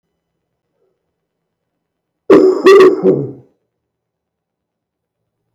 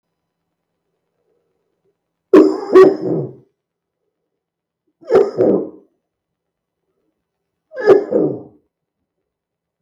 {
  "cough_length": "5.5 s",
  "cough_amplitude": 32768,
  "cough_signal_mean_std_ratio": 0.33,
  "three_cough_length": "9.8 s",
  "three_cough_amplitude": 32768,
  "three_cough_signal_mean_std_ratio": 0.31,
  "survey_phase": "beta (2021-08-13 to 2022-03-07)",
  "age": "45-64",
  "gender": "Male",
  "wearing_mask": "No",
  "symptom_cough_any": true,
  "symptom_sore_throat": true,
  "symptom_onset": "8 days",
  "smoker_status": "Current smoker (1 to 10 cigarettes per day)",
  "respiratory_condition_asthma": false,
  "respiratory_condition_other": false,
  "recruitment_source": "REACT",
  "submission_delay": "1 day",
  "covid_test_result": "Negative",
  "covid_test_method": "RT-qPCR",
  "influenza_a_test_result": "Unknown/Void",
  "influenza_b_test_result": "Unknown/Void"
}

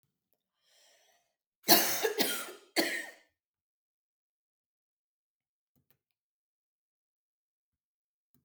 {
  "three_cough_length": "8.4 s",
  "three_cough_amplitude": 16246,
  "three_cough_signal_mean_std_ratio": 0.23,
  "survey_phase": "alpha (2021-03-01 to 2021-08-12)",
  "age": "45-64",
  "gender": "Female",
  "wearing_mask": "No",
  "symptom_none": true,
  "smoker_status": "Ex-smoker",
  "respiratory_condition_asthma": false,
  "respiratory_condition_other": false,
  "recruitment_source": "REACT",
  "submission_delay": "3 days",
  "covid_test_result": "Negative",
  "covid_test_method": "RT-qPCR"
}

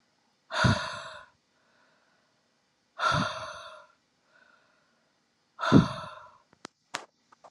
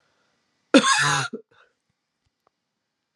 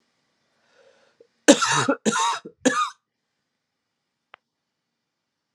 {
  "exhalation_length": "7.5 s",
  "exhalation_amplitude": 21269,
  "exhalation_signal_mean_std_ratio": 0.29,
  "cough_length": "3.2 s",
  "cough_amplitude": 28601,
  "cough_signal_mean_std_ratio": 0.3,
  "three_cough_length": "5.5 s",
  "three_cough_amplitude": 32753,
  "three_cough_signal_mean_std_ratio": 0.3,
  "survey_phase": "beta (2021-08-13 to 2022-03-07)",
  "age": "45-64",
  "gender": "Female",
  "wearing_mask": "No",
  "symptom_cough_any": true,
  "symptom_runny_or_blocked_nose": true,
  "symptom_sore_throat": true,
  "symptom_fatigue": true,
  "symptom_headache": true,
  "symptom_onset": "3 days",
  "smoker_status": "Ex-smoker",
  "respiratory_condition_asthma": false,
  "respiratory_condition_other": false,
  "recruitment_source": "Test and Trace",
  "submission_delay": "2 days",
  "covid_test_result": "Positive",
  "covid_test_method": "RT-qPCR",
  "covid_ct_value": 25.5,
  "covid_ct_gene": "N gene"
}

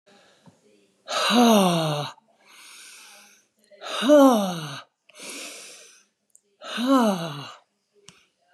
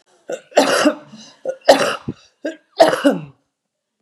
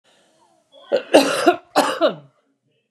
{
  "exhalation_length": "8.5 s",
  "exhalation_amplitude": 22053,
  "exhalation_signal_mean_std_ratio": 0.41,
  "three_cough_length": "4.0 s",
  "three_cough_amplitude": 32768,
  "three_cough_signal_mean_std_ratio": 0.42,
  "cough_length": "2.9 s",
  "cough_amplitude": 32489,
  "cough_signal_mean_std_ratio": 0.4,
  "survey_phase": "beta (2021-08-13 to 2022-03-07)",
  "age": "45-64",
  "gender": "Female",
  "wearing_mask": "No",
  "symptom_cough_any": true,
  "symptom_runny_or_blocked_nose": true,
  "symptom_onset": "12 days",
  "smoker_status": "Current smoker (11 or more cigarettes per day)",
  "respiratory_condition_asthma": false,
  "respiratory_condition_other": false,
  "recruitment_source": "REACT",
  "submission_delay": "0 days",
  "covid_test_result": "Negative",
  "covid_test_method": "RT-qPCR",
  "influenza_a_test_result": "Negative",
  "influenza_b_test_result": "Negative"
}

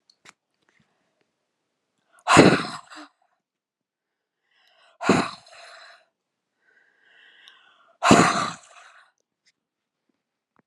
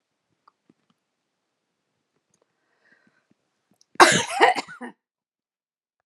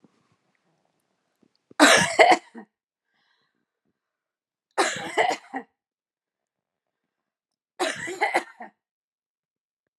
{
  "exhalation_length": "10.7 s",
  "exhalation_amplitude": 32768,
  "exhalation_signal_mean_std_ratio": 0.24,
  "cough_length": "6.1 s",
  "cough_amplitude": 32767,
  "cough_signal_mean_std_ratio": 0.2,
  "three_cough_length": "10.0 s",
  "three_cough_amplitude": 28803,
  "three_cough_signal_mean_std_ratio": 0.27,
  "survey_phase": "beta (2021-08-13 to 2022-03-07)",
  "age": "45-64",
  "gender": "Female",
  "wearing_mask": "No",
  "symptom_cough_any": true,
  "symptom_headache": true,
  "symptom_onset": "7 days",
  "smoker_status": "Ex-smoker",
  "respiratory_condition_asthma": false,
  "respiratory_condition_other": false,
  "recruitment_source": "REACT",
  "submission_delay": "1 day",
  "covid_test_result": "Negative",
  "covid_test_method": "RT-qPCR"
}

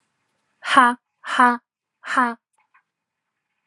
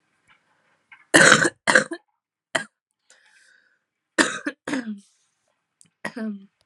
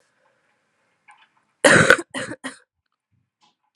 {
  "exhalation_length": "3.7 s",
  "exhalation_amplitude": 30124,
  "exhalation_signal_mean_std_ratio": 0.32,
  "three_cough_length": "6.7 s",
  "three_cough_amplitude": 32768,
  "three_cough_signal_mean_std_ratio": 0.28,
  "cough_length": "3.8 s",
  "cough_amplitude": 32768,
  "cough_signal_mean_std_ratio": 0.25,
  "survey_phase": "alpha (2021-03-01 to 2021-08-12)",
  "age": "18-44",
  "gender": "Female",
  "wearing_mask": "No",
  "symptom_cough_any": true,
  "symptom_fatigue": true,
  "symptom_headache": true,
  "symptom_change_to_sense_of_smell_or_taste": true,
  "symptom_onset": "3 days",
  "smoker_status": "Never smoked",
  "respiratory_condition_asthma": false,
  "respiratory_condition_other": false,
  "recruitment_source": "Test and Trace",
  "submission_delay": "2 days",
  "covid_test_result": "Positive",
  "covid_test_method": "RT-qPCR",
  "covid_ct_value": 21.3,
  "covid_ct_gene": "ORF1ab gene"
}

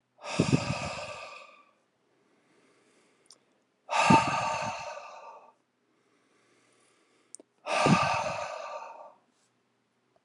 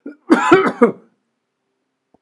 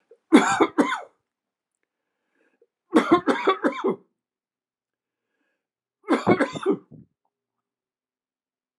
{
  "exhalation_length": "10.2 s",
  "exhalation_amplitude": 13835,
  "exhalation_signal_mean_std_ratio": 0.39,
  "cough_length": "2.2 s",
  "cough_amplitude": 32768,
  "cough_signal_mean_std_ratio": 0.38,
  "three_cough_length": "8.8 s",
  "three_cough_amplitude": 26033,
  "three_cough_signal_mean_std_ratio": 0.33,
  "survey_phase": "beta (2021-08-13 to 2022-03-07)",
  "age": "65+",
  "gender": "Male",
  "wearing_mask": "No",
  "symptom_cough_any": true,
  "symptom_runny_or_blocked_nose": true,
  "symptom_onset": "2 days",
  "smoker_status": "Never smoked",
  "respiratory_condition_asthma": false,
  "respiratory_condition_other": false,
  "recruitment_source": "Test and Trace",
  "submission_delay": "1 day",
  "covid_test_result": "Positive",
  "covid_test_method": "RT-qPCR",
  "covid_ct_value": 16.9,
  "covid_ct_gene": "N gene",
  "covid_ct_mean": 18.0,
  "covid_viral_load": "1300000 copies/ml",
  "covid_viral_load_category": "High viral load (>1M copies/ml)"
}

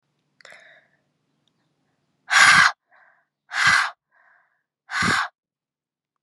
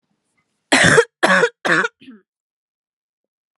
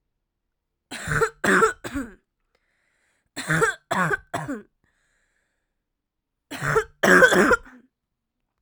{
  "exhalation_length": "6.2 s",
  "exhalation_amplitude": 31793,
  "exhalation_signal_mean_std_ratio": 0.32,
  "cough_length": "3.6 s",
  "cough_amplitude": 32536,
  "cough_signal_mean_std_ratio": 0.38,
  "three_cough_length": "8.6 s",
  "three_cough_amplitude": 27595,
  "three_cough_signal_mean_std_ratio": 0.38,
  "survey_phase": "alpha (2021-03-01 to 2021-08-12)",
  "age": "18-44",
  "gender": "Female",
  "wearing_mask": "No",
  "symptom_cough_any": true,
  "symptom_fatigue": true,
  "symptom_headache": true,
  "symptom_loss_of_taste": true,
  "symptom_onset": "9 days",
  "smoker_status": "Ex-smoker",
  "respiratory_condition_asthma": false,
  "respiratory_condition_other": false,
  "recruitment_source": "Test and Trace",
  "submission_delay": "2 days",
  "covid_test_result": "Positive",
  "covid_test_method": "RT-qPCR"
}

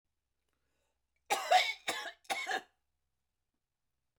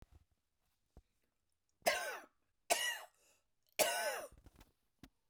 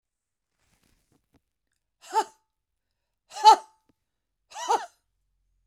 {
  "cough_length": "4.2 s",
  "cough_amplitude": 5942,
  "cough_signal_mean_std_ratio": 0.32,
  "three_cough_length": "5.3 s",
  "three_cough_amplitude": 4302,
  "three_cough_signal_mean_std_ratio": 0.34,
  "exhalation_length": "5.7 s",
  "exhalation_amplitude": 23847,
  "exhalation_signal_mean_std_ratio": 0.19,
  "survey_phase": "beta (2021-08-13 to 2022-03-07)",
  "age": "65+",
  "gender": "Female",
  "wearing_mask": "No",
  "symptom_none": true,
  "smoker_status": "Never smoked",
  "respiratory_condition_asthma": false,
  "respiratory_condition_other": false,
  "recruitment_source": "REACT",
  "submission_delay": "2 days",
  "covid_test_result": "Negative",
  "covid_test_method": "RT-qPCR"
}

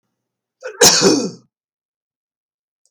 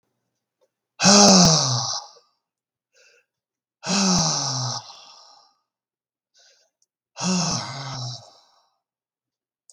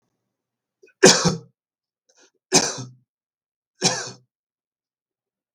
{
  "cough_length": "2.9 s",
  "cough_amplitude": 32768,
  "cough_signal_mean_std_ratio": 0.33,
  "exhalation_length": "9.7 s",
  "exhalation_amplitude": 32766,
  "exhalation_signal_mean_std_ratio": 0.38,
  "three_cough_length": "5.5 s",
  "three_cough_amplitude": 32768,
  "three_cough_signal_mean_std_ratio": 0.25,
  "survey_phase": "beta (2021-08-13 to 2022-03-07)",
  "age": "65+",
  "gender": "Male",
  "wearing_mask": "No",
  "symptom_none": true,
  "smoker_status": "Never smoked",
  "respiratory_condition_asthma": false,
  "respiratory_condition_other": false,
  "recruitment_source": "Test and Trace",
  "submission_delay": "1 day",
  "covid_test_result": "Negative",
  "covid_test_method": "RT-qPCR"
}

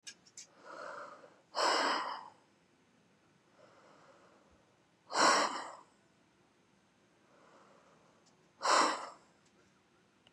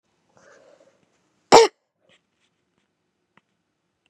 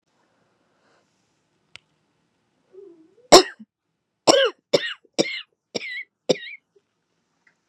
{
  "exhalation_length": "10.3 s",
  "exhalation_amplitude": 5414,
  "exhalation_signal_mean_std_ratio": 0.34,
  "cough_length": "4.1 s",
  "cough_amplitude": 32768,
  "cough_signal_mean_std_ratio": 0.15,
  "three_cough_length": "7.7 s",
  "three_cough_amplitude": 32768,
  "three_cough_signal_mean_std_ratio": 0.21,
  "survey_phase": "beta (2021-08-13 to 2022-03-07)",
  "age": "18-44",
  "gender": "Female",
  "wearing_mask": "Yes",
  "symptom_cough_any": true,
  "symptom_runny_or_blocked_nose": true,
  "symptom_diarrhoea": true,
  "symptom_headache": true,
  "symptom_onset": "4 days",
  "smoker_status": "Ex-smoker",
  "respiratory_condition_asthma": true,
  "respiratory_condition_other": false,
  "recruitment_source": "Test and Trace",
  "submission_delay": "1 day",
  "covid_test_result": "Positive",
  "covid_test_method": "ePCR"
}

